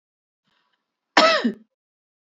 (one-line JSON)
{"cough_length": "2.2 s", "cough_amplitude": 30786, "cough_signal_mean_std_ratio": 0.3, "survey_phase": "beta (2021-08-13 to 2022-03-07)", "age": "45-64", "gender": "Female", "wearing_mask": "No", "symptom_cough_any": true, "symptom_shortness_of_breath": true, "symptom_sore_throat": true, "symptom_fatigue": true, "symptom_change_to_sense_of_smell_or_taste": true, "symptom_loss_of_taste": true, "smoker_status": "Never smoked", "respiratory_condition_asthma": false, "respiratory_condition_other": false, "recruitment_source": "Test and Trace", "submission_delay": "2 days", "covid_test_result": "Positive", "covid_test_method": "LFT"}